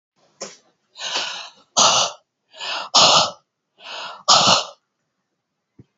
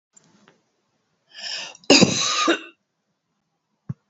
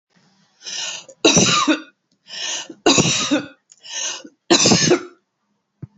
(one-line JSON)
{"exhalation_length": "6.0 s", "exhalation_amplitude": 32062, "exhalation_signal_mean_std_ratio": 0.4, "cough_length": "4.1 s", "cough_amplitude": 28874, "cough_signal_mean_std_ratio": 0.32, "three_cough_length": "6.0 s", "three_cough_amplitude": 30698, "three_cough_signal_mean_std_ratio": 0.49, "survey_phase": "beta (2021-08-13 to 2022-03-07)", "age": "45-64", "gender": "Female", "wearing_mask": "No", "symptom_none": true, "smoker_status": "Current smoker (e-cigarettes or vapes only)", "respiratory_condition_asthma": false, "respiratory_condition_other": false, "recruitment_source": "REACT", "submission_delay": "3 days", "covid_test_result": "Negative", "covid_test_method": "RT-qPCR", "influenza_a_test_result": "Negative", "influenza_b_test_result": "Negative"}